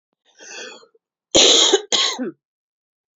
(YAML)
cough_length: 3.2 s
cough_amplitude: 32698
cough_signal_mean_std_ratio: 0.4
survey_phase: alpha (2021-03-01 to 2021-08-12)
age: 18-44
gender: Female
wearing_mask: 'No'
symptom_cough_any: true
symptom_new_continuous_cough: true
symptom_change_to_sense_of_smell_or_taste: true
symptom_loss_of_taste: true
smoker_status: Never smoked
respiratory_condition_asthma: false
respiratory_condition_other: false
recruitment_source: Test and Trace
submission_delay: 1 day
covid_test_result: Positive
covid_test_method: RT-qPCR
covid_ct_value: 28.9
covid_ct_gene: ORF1ab gene
covid_ct_mean: 30.1
covid_viral_load: 140 copies/ml
covid_viral_load_category: Minimal viral load (< 10K copies/ml)